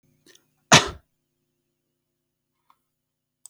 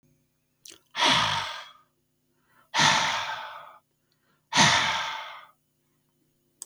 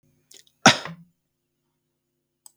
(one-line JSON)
{"cough_length": "3.5 s", "cough_amplitude": 32768, "cough_signal_mean_std_ratio": 0.15, "exhalation_length": "6.7 s", "exhalation_amplitude": 17399, "exhalation_signal_mean_std_ratio": 0.43, "three_cough_length": "2.6 s", "three_cough_amplitude": 32766, "three_cough_signal_mean_std_ratio": 0.16, "survey_phase": "beta (2021-08-13 to 2022-03-07)", "age": "65+", "gender": "Male", "wearing_mask": "No", "symptom_cough_any": true, "symptom_runny_or_blocked_nose": true, "symptom_onset": "8 days", "smoker_status": "Never smoked", "respiratory_condition_asthma": false, "respiratory_condition_other": false, "recruitment_source": "REACT", "submission_delay": "2 days", "covid_test_result": "Negative", "covid_test_method": "RT-qPCR", "influenza_a_test_result": "Unknown/Void", "influenza_b_test_result": "Unknown/Void"}